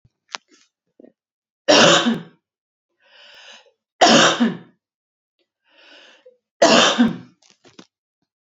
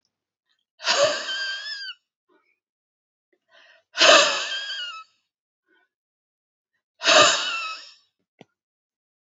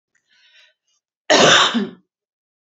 {
  "three_cough_length": "8.4 s",
  "three_cough_amplitude": 32194,
  "three_cough_signal_mean_std_ratio": 0.35,
  "exhalation_length": "9.3 s",
  "exhalation_amplitude": 30073,
  "exhalation_signal_mean_std_ratio": 0.34,
  "cough_length": "2.6 s",
  "cough_amplitude": 30272,
  "cough_signal_mean_std_ratio": 0.37,
  "survey_phase": "beta (2021-08-13 to 2022-03-07)",
  "age": "45-64",
  "gender": "Female",
  "wearing_mask": "No",
  "symptom_other": true,
  "smoker_status": "Never smoked",
  "respiratory_condition_asthma": false,
  "respiratory_condition_other": false,
  "recruitment_source": "Test and Trace",
  "submission_delay": "9 days",
  "covid_test_result": "Negative",
  "covid_test_method": "RT-qPCR"
}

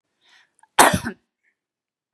{
  "cough_length": "2.1 s",
  "cough_amplitude": 32767,
  "cough_signal_mean_std_ratio": 0.24,
  "survey_phase": "beta (2021-08-13 to 2022-03-07)",
  "age": "45-64",
  "gender": "Female",
  "wearing_mask": "No",
  "symptom_none": true,
  "smoker_status": "Never smoked",
  "respiratory_condition_asthma": false,
  "respiratory_condition_other": false,
  "recruitment_source": "REACT",
  "submission_delay": "1 day",
  "covid_test_result": "Negative",
  "covid_test_method": "RT-qPCR",
  "influenza_a_test_result": "Negative",
  "influenza_b_test_result": "Negative"
}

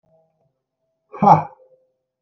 {
  "exhalation_length": "2.2 s",
  "exhalation_amplitude": 32768,
  "exhalation_signal_mean_std_ratio": 0.24,
  "survey_phase": "beta (2021-08-13 to 2022-03-07)",
  "age": "18-44",
  "gender": "Male",
  "wearing_mask": "No",
  "symptom_none": true,
  "smoker_status": "Never smoked",
  "respiratory_condition_asthma": false,
  "respiratory_condition_other": false,
  "recruitment_source": "REACT",
  "submission_delay": "1 day",
  "covid_test_result": "Negative",
  "covid_test_method": "RT-qPCR"
}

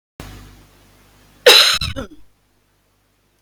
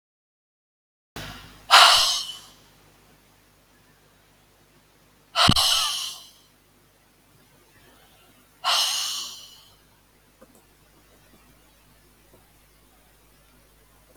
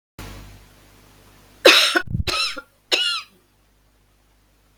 {
  "cough_length": "3.4 s",
  "cough_amplitude": 31652,
  "cough_signal_mean_std_ratio": 0.3,
  "exhalation_length": "14.2 s",
  "exhalation_amplitude": 31568,
  "exhalation_signal_mean_std_ratio": 0.28,
  "three_cough_length": "4.8 s",
  "three_cough_amplitude": 32308,
  "three_cough_signal_mean_std_ratio": 0.35,
  "survey_phase": "beta (2021-08-13 to 2022-03-07)",
  "age": "45-64",
  "gender": "Female",
  "wearing_mask": "No",
  "symptom_none": true,
  "smoker_status": "Never smoked",
  "respiratory_condition_asthma": false,
  "respiratory_condition_other": false,
  "recruitment_source": "REACT",
  "submission_delay": "1 day",
  "covid_test_result": "Negative",
  "covid_test_method": "RT-qPCR",
  "influenza_a_test_result": "Negative",
  "influenza_b_test_result": "Negative"
}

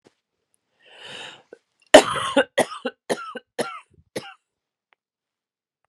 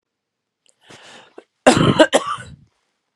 {
  "three_cough_length": "5.9 s",
  "three_cough_amplitude": 32768,
  "three_cough_signal_mean_std_ratio": 0.23,
  "cough_length": "3.2 s",
  "cough_amplitude": 32768,
  "cough_signal_mean_std_ratio": 0.32,
  "survey_phase": "beta (2021-08-13 to 2022-03-07)",
  "age": "45-64",
  "gender": "Female",
  "wearing_mask": "No",
  "symptom_cough_any": true,
  "smoker_status": "Never smoked",
  "respiratory_condition_asthma": false,
  "respiratory_condition_other": false,
  "recruitment_source": "REACT",
  "submission_delay": "4 days",
  "covid_test_result": "Negative",
  "covid_test_method": "RT-qPCR",
  "influenza_a_test_result": "Unknown/Void",
  "influenza_b_test_result": "Unknown/Void"
}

